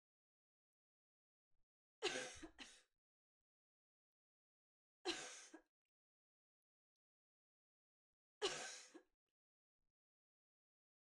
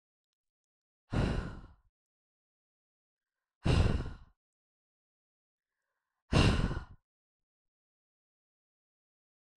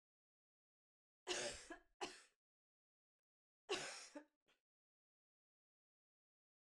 {
  "three_cough_length": "11.1 s",
  "three_cough_amplitude": 1433,
  "three_cough_signal_mean_std_ratio": 0.24,
  "exhalation_length": "9.6 s",
  "exhalation_amplitude": 7672,
  "exhalation_signal_mean_std_ratio": 0.28,
  "cough_length": "6.7 s",
  "cough_amplitude": 1014,
  "cough_signal_mean_std_ratio": 0.28,
  "survey_phase": "beta (2021-08-13 to 2022-03-07)",
  "age": "45-64",
  "gender": "Female",
  "wearing_mask": "No",
  "symptom_cough_any": true,
  "symptom_runny_or_blocked_nose": true,
  "smoker_status": "Never smoked",
  "respiratory_condition_asthma": false,
  "respiratory_condition_other": false,
  "recruitment_source": "Test and Trace",
  "submission_delay": "2 days",
  "covid_test_result": "Positive",
  "covid_test_method": "LFT"
}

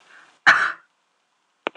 {
  "cough_length": "1.8 s",
  "cough_amplitude": 26028,
  "cough_signal_mean_std_ratio": 0.29,
  "survey_phase": "alpha (2021-03-01 to 2021-08-12)",
  "age": "45-64",
  "gender": "Female",
  "wearing_mask": "No",
  "symptom_fatigue": true,
  "symptom_onset": "12 days",
  "smoker_status": "Ex-smoker",
  "respiratory_condition_asthma": false,
  "respiratory_condition_other": false,
  "recruitment_source": "REACT",
  "submission_delay": "1 day",
  "covid_test_result": "Negative",
  "covid_test_method": "RT-qPCR"
}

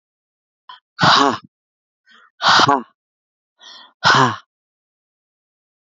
{
  "exhalation_length": "5.8 s",
  "exhalation_amplitude": 32767,
  "exhalation_signal_mean_std_ratio": 0.34,
  "survey_phase": "alpha (2021-03-01 to 2021-08-12)",
  "age": "45-64",
  "gender": "Female",
  "wearing_mask": "No",
  "symptom_cough_any": true,
  "symptom_fatigue": true,
  "symptom_fever_high_temperature": true,
  "symptom_onset": "3 days",
  "smoker_status": "Never smoked",
  "respiratory_condition_asthma": false,
  "respiratory_condition_other": false,
  "recruitment_source": "Test and Trace",
  "submission_delay": "2 days",
  "covid_test_result": "Positive",
  "covid_test_method": "RT-qPCR",
  "covid_ct_value": 22.4,
  "covid_ct_gene": "ORF1ab gene",
  "covid_ct_mean": 22.8,
  "covid_viral_load": "34000 copies/ml",
  "covid_viral_load_category": "Low viral load (10K-1M copies/ml)"
}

